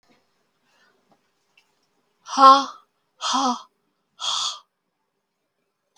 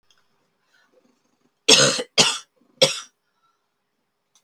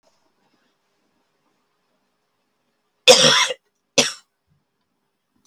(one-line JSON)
{"exhalation_length": "6.0 s", "exhalation_amplitude": 32766, "exhalation_signal_mean_std_ratio": 0.25, "three_cough_length": "4.4 s", "three_cough_amplitude": 32768, "three_cough_signal_mean_std_ratio": 0.28, "cough_length": "5.5 s", "cough_amplitude": 32768, "cough_signal_mean_std_ratio": 0.23, "survey_phase": "beta (2021-08-13 to 2022-03-07)", "age": "45-64", "gender": "Female", "wearing_mask": "No", "symptom_cough_any": true, "symptom_runny_or_blocked_nose": true, "symptom_shortness_of_breath": true, "symptom_sore_throat": true, "symptom_abdominal_pain": true, "symptom_diarrhoea": true, "symptom_fatigue": true, "symptom_headache": true, "symptom_onset": "2 days", "smoker_status": "Never smoked", "respiratory_condition_asthma": false, "respiratory_condition_other": false, "recruitment_source": "Test and Trace", "submission_delay": "1 day", "covid_test_result": "Positive", "covid_test_method": "RT-qPCR", "covid_ct_value": 16.4, "covid_ct_gene": "N gene"}